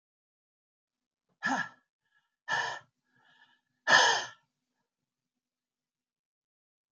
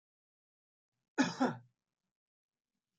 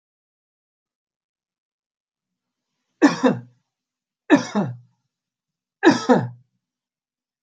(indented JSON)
{
  "exhalation_length": "6.9 s",
  "exhalation_amplitude": 13378,
  "exhalation_signal_mean_std_ratio": 0.25,
  "cough_length": "3.0 s",
  "cough_amplitude": 3988,
  "cough_signal_mean_std_ratio": 0.24,
  "three_cough_length": "7.4 s",
  "three_cough_amplitude": 30587,
  "three_cough_signal_mean_std_ratio": 0.26,
  "survey_phase": "alpha (2021-03-01 to 2021-08-12)",
  "age": "65+",
  "gender": "Male",
  "wearing_mask": "No",
  "symptom_none": true,
  "smoker_status": "Ex-smoker",
  "respiratory_condition_asthma": false,
  "respiratory_condition_other": false,
  "recruitment_source": "REACT",
  "submission_delay": "1 day",
  "covid_test_result": "Negative",
  "covid_test_method": "RT-qPCR"
}